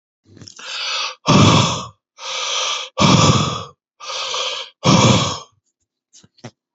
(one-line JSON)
{"exhalation_length": "6.7 s", "exhalation_amplitude": 31427, "exhalation_signal_mean_std_ratio": 0.54, "survey_phase": "beta (2021-08-13 to 2022-03-07)", "age": "45-64", "gender": "Male", "wearing_mask": "No", "symptom_none": true, "smoker_status": "Ex-smoker", "respiratory_condition_asthma": false, "respiratory_condition_other": false, "recruitment_source": "REACT", "submission_delay": "2 days", "covid_test_result": "Negative", "covid_test_method": "RT-qPCR", "influenza_a_test_result": "Negative", "influenza_b_test_result": "Negative"}